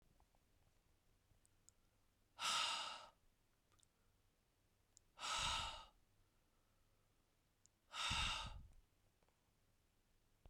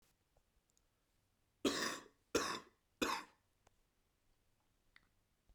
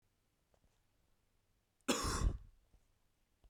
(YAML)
exhalation_length: 10.5 s
exhalation_amplitude: 1097
exhalation_signal_mean_std_ratio: 0.37
three_cough_length: 5.5 s
three_cough_amplitude: 2468
three_cough_signal_mean_std_ratio: 0.3
cough_length: 3.5 s
cough_amplitude: 2674
cough_signal_mean_std_ratio: 0.31
survey_phase: beta (2021-08-13 to 2022-03-07)
age: 18-44
gender: Male
wearing_mask: 'No'
symptom_cough_any: true
symptom_runny_or_blocked_nose: true
symptom_sore_throat: true
symptom_change_to_sense_of_smell_or_taste: true
symptom_loss_of_taste: true
symptom_onset: 3 days
smoker_status: Never smoked
respiratory_condition_asthma: false
respiratory_condition_other: false
recruitment_source: Test and Trace
submission_delay: 1 day
covid_test_result: Positive
covid_test_method: RT-qPCR